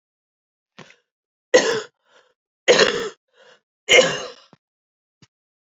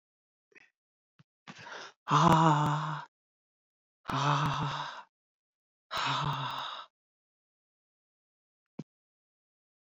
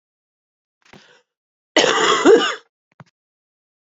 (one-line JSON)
{"three_cough_length": "5.7 s", "three_cough_amplitude": 31827, "three_cough_signal_mean_std_ratio": 0.29, "exhalation_length": "9.8 s", "exhalation_amplitude": 11733, "exhalation_signal_mean_std_ratio": 0.38, "cough_length": "3.9 s", "cough_amplitude": 32768, "cough_signal_mean_std_ratio": 0.34, "survey_phase": "beta (2021-08-13 to 2022-03-07)", "age": "65+", "gender": "Female", "wearing_mask": "No", "symptom_cough_any": true, "symptom_runny_or_blocked_nose": true, "symptom_fatigue": true, "symptom_onset": "4 days", "smoker_status": "Ex-smoker", "respiratory_condition_asthma": false, "respiratory_condition_other": false, "recruitment_source": "Test and Trace", "submission_delay": "1 day", "covid_test_result": "Positive", "covid_test_method": "RT-qPCR", "covid_ct_value": 15.5, "covid_ct_gene": "ORF1ab gene", "covid_ct_mean": 16.0, "covid_viral_load": "5700000 copies/ml", "covid_viral_load_category": "High viral load (>1M copies/ml)"}